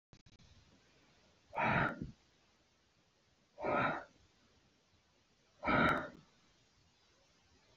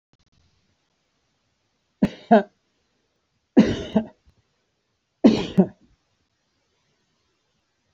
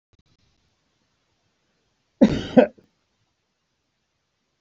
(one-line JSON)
{"exhalation_length": "7.8 s", "exhalation_amplitude": 3450, "exhalation_signal_mean_std_ratio": 0.35, "three_cough_length": "7.9 s", "three_cough_amplitude": 26396, "three_cough_signal_mean_std_ratio": 0.23, "cough_length": "4.6 s", "cough_amplitude": 26528, "cough_signal_mean_std_ratio": 0.18, "survey_phase": "beta (2021-08-13 to 2022-03-07)", "age": "45-64", "gender": "Male", "wearing_mask": "No", "symptom_none": true, "smoker_status": "Never smoked", "respiratory_condition_asthma": false, "respiratory_condition_other": false, "recruitment_source": "Test and Trace", "submission_delay": "0 days", "covid_test_result": "Negative", "covid_test_method": "LFT"}